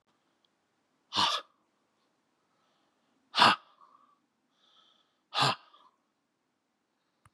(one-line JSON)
{"exhalation_length": "7.3 s", "exhalation_amplitude": 15784, "exhalation_signal_mean_std_ratio": 0.22, "survey_phase": "beta (2021-08-13 to 2022-03-07)", "age": "45-64", "gender": "Male", "wearing_mask": "No", "symptom_cough_any": true, "symptom_runny_or_blocked_nose": true, "symptom_shortness_of_breath": true, "symptom_change_to_sense_of_smell_or_taste": true, "symptom_onset": "5 days", "smoker_status": "Never smoked", "respiratory_condition_asthma": false, "respiratory_condition_other": false, "recruitment_source": "Test and Trace", "submission_delay": "3 days", "covid_test_result": "Positive", "covid_test_method": "RT-qPCR", "covid_ct_value": 15.1, "covid_ct_gene": "ORF1ab gene", "covid_ct_mean": 15.2, "covid_viral_load": "11000000 copies/ml", "covid_viral_load_category": "High viral load (>1M copies/ml)"}